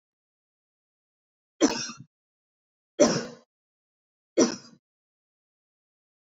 {
  "three_cough_length": "6.2 s",
  "three_cough_amplitude": 16436,
  "three_cough_signal_mean_std_ratio": 0.23,
  "survey_phase": "beta (2021-08-13 to 2022-03-07)",
  "age": "18-44",
  "gender": "Female",
  "wearing_mask": "No",
  "symptom_fatigue": true,
  "symptom_headache": true,
  "smoker_status": "Never smoked",
  "respiratory_condition_asthma": false,
  "respiratory_condition_other": false,
  "recruitment_source": "REACT",
  "submission_delay": "2 days",
  "covid_test_result": "Negative",
  "covid_test_method": "RT-qPCR",
  "influenza_a_test_result": "Negative",
  "influenza_b_test_result": "Negative"
}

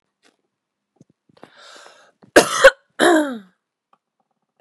{
  "cough_length": "4.6 s",
  "cough_amplitude": 32768,
  "cough_signal_mean_std_ratio": 0.26,
  "survey_phase": "beta (2021-08-13 to 2022-03-07)",
  "age": "18-44",
  "gender": "Female",
  "wearing_mask": "No",
  "symptom_cough_any": true,
  "symptom_sore_throat": true,
  "symptom_onset": "4 days",
  "smoker_status": "Ex-smoker",
  "respiratory_condition_asthma": true,
  "respiratory_condition_other": false,
  "recruitment_source": "Test and Trace",
  "submission_delay": "1 day",
  "covid_test_result": "Negative",
  "covid_test_method": "RT-qPCR"
}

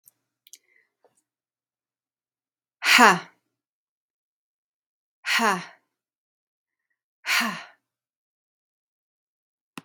{
  "exhalation_length": "9.8 s",
  "exhalation_amplitude": 32767,
  "exhalation_signal_mean_std_ratio": 0.21,
  "survey_phase": "beta (2021-08-13 to 2022-03-07)",
  "age": "45-64",
  "gender": "Female",
  "wearing_mask": "No",
  "symptom_sore_throat": true,
  "smoker_status": "Never smoked",
  "respiratory_condition_asthma": false,
  "respiratory_condition_other": false,
  "recruitment_source": "REACT",
  "submission_delay": "1 day",
  "covid_test_result": "Negative",
  "covid_test_method": "RT-qPCR"
}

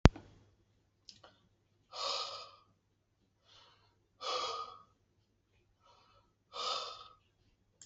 {
  "exhalation_length": "7.9 s",
  "exhalation_amplitude": 27266,
  "exhalation_signal_mean_std_ratio": 0.21,
  "survey_phase": "alpha (2021-03-01 to 2021-08-12)",
  "age": "45-64",
  "gender": "Male",
  "wearing_mask": "No",
  "symptom_none": true,
  "smoker_status": "Never smoked",
  "respiratory_condition_asthma": false,
  "respiratory_condition_other": false,
  "recruitment_source": "REACT",
  "submission_delay": "1 day",
  "covid_test_result": "Negative",
  "covid_test_method": "RT-qPCR"
}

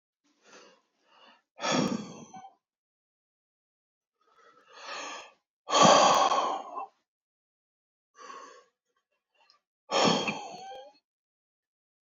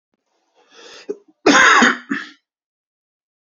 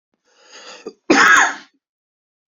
{
  "exhalation_length": "12.1 s",
  "exhalation_amplitude": 16133,
  "exhalation_signal_mean_std_ratio": 0.32,
  "cough_length": "3.4 s",
  "cough_amplitude": 32768,
  "cough_signal_mean_std_ratio": 0.35,
  "three_cough_length": "2.5 s",
  "three_cough_amplitude": 32768,
  "three_cough_signal_mean_std_ratio": 0.36,
  "survey_phase": "beta (2021-08-13 to 2022-03-07)",
  "age": "45-64",
  "gender": "Male",
  "wearing_mask": "No",
  "symptom_cough_any": true,
  "symptom_runny_or_blocked_nose": true,
  "symptom_fatigue": true,
  "symptom_headache": true,
  "symptom_change_to_sense_of_smell_or_taste": true,
  "symptom_onset": "2 days",
  "smoker_status": "Prefer not to say",
  "respiratory_condition_asthma": true,
  "respiratory_condition_other": false,
  "recruitment_source": "Test and Trace",
  "submission_delay": "2 days",
  "covid_test_result": "Positive",
  "covid_test_method": "RT-qPCR",
  "covid_ct_value": 15.5,
  "covid_ct_gene": "ORF1ab gene",
  "covid_ct_mean": 20.9,
  "covid_viral_load": "140000 copies/ml",
  "covid_viral_load_category": "Low viral load (10K-1M copies/ml)"
}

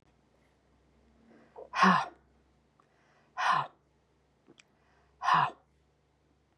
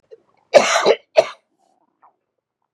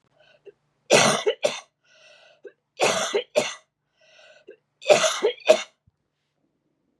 {
  "exhalation_length": "6.6 s",
  "exhalation_amplitude": 9326,
  "exhalation_signal_mean_std_ratio": 0.29,
  "cough_length": "2.7 s",
  "cough_amplitude": 32768,
  "cough_signal_mean_std_ratio": 0.3,
  "three_cough_length": "7.0 s",
  "three_cough_amplitude": 29145,
  "three_cough_signal_mean_std_ratio": 0.35,
  "survey_phase": "beta (2021-08-13 to 2022-03-07)",
  "age": "65+",
  "gender": "Female",
  "wearing_mask": "No",
  "symptom_cough_any": true,
  "symptom_onset": "12 days",
  "smoker_status": "Ex-smoker",
  "respiratory_condition_asthma": false,
  "respiratory_condition_other": false,
  "recruitment_source": "REACT",
  "submission_delay": "3 days",
  "covid_test_result": "Negative",
  "covid_test_method": "RT-qPCR",
  "influenza_a_test_result": "Negative",
  "influenza_b_test_result": "Negative"
}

